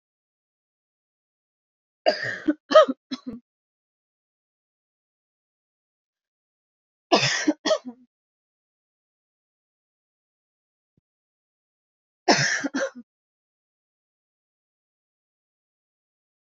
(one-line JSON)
{"three_cough_length": "16.5 s", "three_cough_amplitude": 26989, "three_cough_signal_mean_std_ratio": 0.21, "survey_phase": "beta (2021-08-13 to 2022-03-07)", "age": "18-44", "gender": "Female", "wearing_mask": "No", "symptom_runny_or_blocked_nose": true, "symptom_diarrhoea": true, "symptom_headache": true, "smoker_status": "Never smoked", "respiratory_condition_asthma": false, "respiratory_condition_other": false, "recruitment_source": "Test and Trace", "submission_delay": "2 days", "covid_test_result": "Positive", "covid_test_method": "RT-qPCR", "covid_ct_value": 28.3, "covid_ct_gene": "N gene", "covid_ct_mean": 29.2, "covid_viral_load": "270 copies/ml", "covid_viral_load_category": "Minimal viral load (< 10K copies/ml)"}